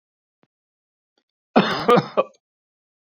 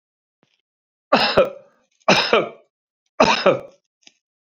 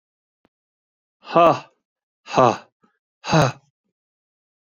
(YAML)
cough_length: 3.2 s
cough_amplitude: 27474
cough_signal_mean_std_ratio: 0.29
three_cough_length: 4.4 s
three_cough_amplitude: 29199
three_cough_signal_mean_std_ratio: 0.38
exhalation_length: 4.8 s
exhalation_amplitude: 28115
exhalation_signal_mean_std_ratio: 0.29
survey_phase: beta (2021-08-13 to 2022-03-07)
age: 65+
gender: Male
wearing_mask: 'No'
symptom_none: true
smoker_status: Never smoked
respiratory_condition_asthma: false
respiratory_condition_other: false
recruitment_source: REACT
submission_delay: 1 day
covid_test_result: Negative
covid_test_method: RT-qPCR
influenza_a_test_result: Negative
influenza_b_test_result: Negative